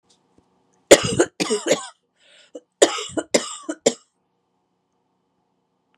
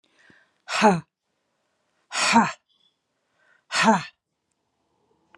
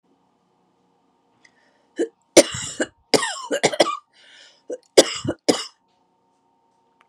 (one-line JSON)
{"cough_length": "6.0 s", "cough_amplitude": 32768, "cough_signal_mean_std_ratio": 0.27, "exhalation_length": "5.4 s", "exhalation_amplitude": 23599, "exhalation_signal_mean_std_ratio": 0.31, "three_cough_length": "7.1 s", "three_cough_amplitude": 32768, "three_cough_signal_mean_std_ratio": 0.27, "survey_phase": "beta (2021-08-13 to 2022-03-07)", "age": "65+", "gender": "Female", "wearing_mask": "No", "symptom_none": true, "smoker_status": "Never smoked", "respiratory_condition_asthma": false, "respiratory_condition_other": false, "recruitment_source": "REACT", "submission_delay": "1 day", "covid_test_result": "Negative", "covid_test_method": "RT-qPCR", "influenza_a_test_result": "Negative", "influenza_b_test_result": "Negative"}